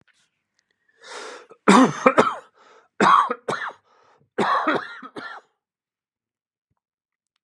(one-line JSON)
{"three_cough_length": "7.4 s", "three_cough_amplitude": 32638, "three_cough_signal_mean_std_ratio": 0.34, "survey_phase": "beta (2021-08-13 to 2022-03-07)", "age": "65+", "gender": "Male", "wearing_mask": "No", "symptom_none": true, "smoker_status": "Ex-smoker", "respiratory_condition_asthma": false, "respiratory_condition_other": false, "recruitment_source": "REACT", "submission_delay": "2 days", "covid_test_result": "Negative", "covid_test_method": "RT-qPCR", "influenza_a_test_result": "Negative", "influenza_b_test_result": "Negative"}